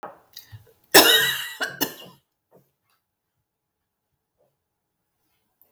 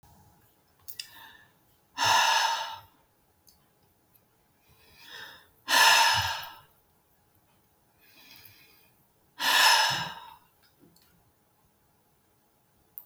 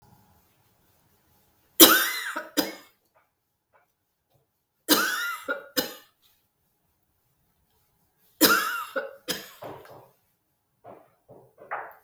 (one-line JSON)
{"cough_length": "5.7 s", "cough_amplitude": 32768, "cough_signal_mean_std_ratio": 0.24, "exhalation_length": "13.1 s", "exhalation_amplitude": 15500, "exhalation_signal_mean_std_ratio": 0.34, "three_cough_length": "12.0 s", "three_cough_amplitude": 32768, "three_cough_signal_mean_std_ratio": 0.27, "survey_phase": "beta (2021-08-13 to 2022-03-07)", "age": "65+", "gender": "Female", "wearing_mask": "No", "symptom_runny_or_blocked_nose": true, "smoker_status": "Never smoked", "respiratory_condition_asthma": false, "respiratory_condition_other": false, "recruitment_source": "REACT", "submission_delay": "3 days", "covid_test_result": "Negative", "covid_test_method": "RT-qPCR", "influenza_a_test_result": "Negative", "influenza_b_test_result": "Negative"}